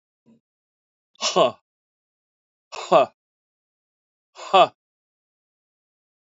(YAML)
exhalation_length: 6.2 s
exhalation_amplitude: 24643
exhalation_signal_mean_std_ratio: 0.23
survey_phase: beta (2021-08-13 to 2022-03-07)
age: 65+
gender: Male
wearing_mask: 'No'
symptom_cough_any: true
symptom_sore_throat: true
symptom_fatigue: true
symptom_headache: true
smoker_status: Current smoker (e-cigarettes or vapes only)
respiratory_condition_asthma: false
respiratory_condition_other: true
recruitment_source: Test and Trace
submission_delay: 2 days
covid_test_result: Negative
covid_test_method: LFT